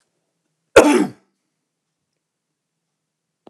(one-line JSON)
{"cough_length": "3.5 s", "cough_amplitude": 29204, "cough_signal_mean_std_ratio": 0.22, "survey_phase": "alpha (2021-03-01 to 2021-08-12)", "age": "65+", "gender": "Male", "wearing_mask": "No", "symptom_none": true, "symptom_onset": "3 days", "smoker_status": "Never smoked", "respiratory_condition_asthma": false, "respiratory_condition_other": false, "recruitment_source": "REACT", "submission_delay": "2 days", "covid_test_result": "Negative", "covid_test_method": "RT-qPCR"}